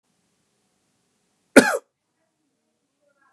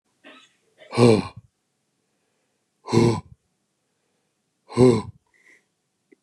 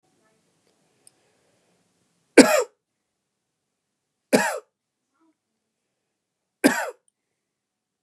{"cough_length": "3.3 s", "cough_amplitude": 32768, "cough_signal_mean_std_ratio": 0.15, "exhalation_length": "6.2 s", "exhalation_amplitude": 26183, "exhalation_signal_mean_std_ratio": 0.28, "three_cough_length": "8.0 s", "three_cough_amplitude": 32768, "three_cough_signal_mean_std_ratio": 0.19, "survey_phase": "beta (2021-08-13 to 2022-03-07)", "age": "45-64", "gender": "Male", "wearing_mask": "No", "symptom_cough_any": true, "symptom_runny_or_blocked_nose": true, "smoker_status": "Never smoked", "respiratory_condition_asthma": false, "respiratory_condition_other": false, "recruitment_source": "Test and Trace", "submission_delay": "2 days", "covid_test_result": "Positive", "covid_test_method": "LFT"}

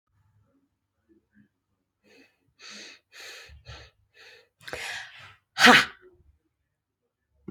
{"exhalation_length": "7.5 s", "exhalation_amplitude": 27875, "exhalation_signal_mean_std_ratio": 0.19, "survey_phase": "beta (2021-08-13 to 2022-03-07)", "age": "45-64", "gender": "Female", "wearing_mask": "No", "symptom_none": true, "smoker_status": "Ex-smoker", "respiratory_condition_asthma": false, "respiratory_condition_other": false, "recruitment_source": "REACT", "submission_delay": "2 days", "covid_test_result": "Negative", "covid_test_method": "RT-qPCR"}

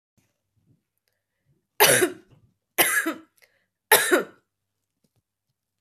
{"three_cough_length": "5.8 s", "three_cough_amplitude": 27792, "three_cough_signal_mean_std_ratio": 0.3, "survey_phase": "beta (2021-08-13 to 2022-03-07)", "age": "18-44", "gender": "Female", "wearing_mask": "No", "symptom_runny_or_blocked_nose": true, "smoker_status": "Never smoked", "respiratory_condition_asthma": false, "respiratory_condition_other": false, "recruitment_source": "Test and Trace", "submission_delay": "1 day", "covid_test_result": "Positive", "covid_test_method": "LFT"}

